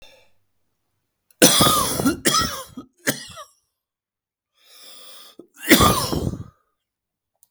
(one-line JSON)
{"cough_length": "7.5 s", "cough_amplitude": 32768, "cough_signal_mean_std_ratio": 0.37, "survey_phase": "beta (2021-08-13 to 2022-03-07)", "age": "45-64", "gender": "Male", "wearing_mask": "No", "symptom_none": true, "smoker_status": "Never smoked", "respiratory_condition_asthma": true, "respiratory_condition_other": false, "recruitment_source": "REACT", "submission_delay": "1 day", "covid_test_result": "Negative", "covid_test_method": "RT-qPCR", "influenza_a_test_result": "Negative", "influenza_b_test_result": "Negative"}